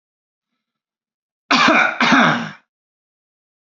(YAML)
cough_length: 3.7 s
cough_amplitude: 28512
cough_signal_mean_std_ratio: 0.4
survey_phase: alpha (2021-03-01 to 2021-08-12)
age: 18-44
gender: Male
wearing_mask: 'No'
symptom_none: true
smoker_status: Never smoked
respiratory_condition_asthma: false
respiratory_condition_other: false
recruitment_source: REACT
submission_delay: 2 days
covid_test_result: Negative
covid_test_method: RT-qPCR